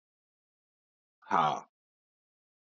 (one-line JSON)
{"exhalation_length": "2.7 s", "exhalation_amplitude": 8184, "exhalation_signal_mean_std_ratio": 0.24, "survey_phase": "beta (2021-08-13 to 2022-03-07)", "age": "45-64", "gender": "Male", "wearing_mask": "No", "symptom_cough_any": true, "symptom_runny_or_blocked_nose": true, "symptom_shortness_of_breath": true, "symptom_sore_throat": true, "symptom_fatigue": true, "symptom_fever_high_temperature": true, "symptom_headache": true, "symptom_other": true, "symptom_onset": "2 days", "smoker_status": "Never smoked", "respiratory_condition_asthma": false, "respiratory_condition_other": false, "recruitment_source": "Test and Trace", "submission_delay": "1 day", "covid_test_result": "Positive", "covid_test_method": "RT-qPCR", "covid_ct_value": 21.6, "covid_ct_gene": "N gene", "covid_ct_mean": 22.2, "covid_viral_load": "51000 copies/ml", "covid_viral_load_category": "Low viral load (10K-1M copies/ml)"}